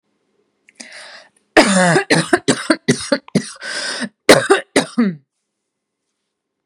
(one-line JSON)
{"cough_length": "6.7 s", "cough_amplitude": 32768, "cough_signal_mean_std_ratio": 0.41, "survey_phase": "beta (2021-08-13 to 2022-03-07)", "age": "18-44", "gender": "Female", "wearing_mask": "No", "symptom_none": true, "smoker_status": "Ex-smoker", "respiratory_condition_asthma": false, "respiratory_condition_other": false, "recruitment_source": "REACT", "submission_delay": "14 days", "covid_test_result": "Negative", "covid_test_method": "RT-qPCR"}